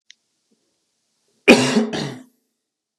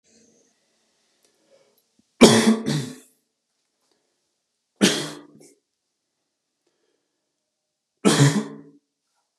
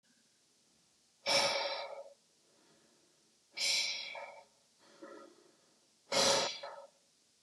cough_length: 3.0 s
cough_amplitude: 32768
cough_signal_mean_std_ratio: 0.29
three_cough_length: 9.4 s
three_cough_amplitude: 32768
three_cough_signal_mean_std_ratio: 0.26
exhalation_length: 7.4 s
exhalation_amplitude: 5381
exhalation_signal_mean_std_ratio: 0.41
survey_phase: beta (2021-08-13 to 2022-03-07)
age: 18-44
gender: Male
wearing_mask: 'No'
symptom_none: true
smoker_status: Never smoked
respiratory_condition_asthma: false
respiratory_condition_other: false
recruitment_source: REACT
submission_delay: 2 days
covid_test_result: Positive
covid_test_method: RT-qPCR
covid_ct_value: 34.0
covid_ct_gene: N gene
influenza_a_test_result: Negative
influenza_b_test_result: Negative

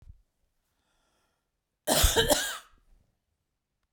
cough_length: 3.9 s
cough_amplitude: 12957
cough_signal_mean_std_ratio: 0.31
survey_phase: beta (2021-08-13 to 2022-03-07)
age: 45-64
gender: Female
wearing_mask: 'No'
symptom_none: true
smoker_status: Ex-smoker
respiratory_condition_asthma: false
respiratory_condition_other: false
recruitment_source: REACT
submission_delay: 2 days
covid_test_result: Negative
covid_test_method: RT-qPCR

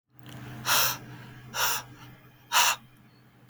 exhalation_length: 3.5 s
exhalation_amplitude: 12531
exhalation_signal_mean_std_ratio: 0.47
survey_phase: beta (2021-08-13 to 2022-03-07)
age: 18-44
gender: Male
wearing_mask: 'No'
symptom_cough_any: true
symptom_new_continuous_cough: true
symptom_runny_or_blocked_nose: true
symptom_shortness_of_breath: true
symptom_sore_throat: true
symptom_fever_high_temperature: true
symptom_headache: true
symptom_change_to_sense_of_smell_or_taste: true
symptom_loss_of_taste: true
symptom_other: true
symptom_onset: 5 days
smoker_status: Current smoker (1 to 10 cigarettes per day)
respiratory_condition_asthma: false
respiratory_condition_other: false
recruitment_source: Test and Trace
submission_delay: 1 day
covid_test_result: Positive
covid_test_method: RT-qPCR
covid_ct_value: 36.1
covid_ct_gene: ORF1ab gene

